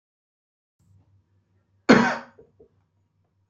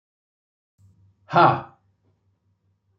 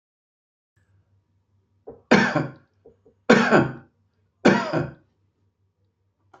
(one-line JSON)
{"cough_length": "3.5 s", "cough_amplitude": 26756, "cough_signal_mean_std_ratio": 0.21, "exhalation_length": "3.0 s", "exhalation_amplitude": 20852, "exhalation_signal_mean_std_ratio": 0.23, "three_cough_length": "6.4 s", "three_cough_amplitude": 30806, "three_cough_signal_mean_std_ratio": 0.31, "survey_phase": "beta (2021-08-13 to 2022-03-07)", "age": "65+", "gender": "Male", "wearing_mask": "No", "symptom_none": true, "smoker_status": "Never smoked", "respiratory_condition_asthma": false, "respiratory_condition_other": false, "recruitment_source": "REACT", "submission_delay": "3 days", "covid_test_result": "Negative", "covid_test_method": "RT-qPCR", "influenza_a_test_result": "Negative", "influenza_b_test_result": "Negative"}